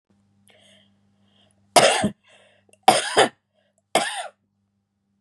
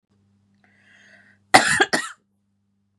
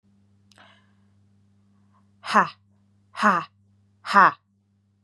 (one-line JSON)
{"three_cough_length": "5.2 s", "three_cough_amplitude": 31851, "three_cough_signal_mean_std_ratio": 0.3, "cough_length": "3.0 s", "cough_amplitude": 32768, "cough_signal_mean_std_ratio": 0.26, "exhalation_length": "5.0 s", "exhalation_amplitude": 27372, "exhalation_signal_mean_std_ratio": 0.25, "survey_phase": "beta (2021-08-13 to 2022-03-07)", "age": "18-44", "gender": "Female", "wearing_mask": "No", "symptom_none": true, "smoker_status": "Never smoked", "respiratory_condition_asthma": false, "respiratory_condition_other": false, "recruitment_source": "REACT", "submission_delay": "1 day", "covid_test_result": "Negative", "covid_test_method": "RT-qPCR", "influenza_a_test_result": "Negative", "influenza_b_test_result": "Negative"}